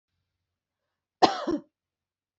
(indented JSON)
{
  "cough_length": "2.4 s",
  "cough_amplitude": 24757,
  "cough_signal_mean_std_ratio": 0.22,
  "survey_phase": "beta (2021-08-13 to 2022-03-07)",
  "age": "18-44",
  "gender": "Female",
  "wearing_mask": "No",
  "symptom_none": true,
  "smoker_status": "Ex-smoker",
  "respiratory_condition_asthma": false,
  "respiratory_condition_other": false,
  "recruitment_source": "REACT",
  "submission_delay": "2 days",
  "covid_test_result": "Negative",
  "covid_test_method": "RT-qPCR"
}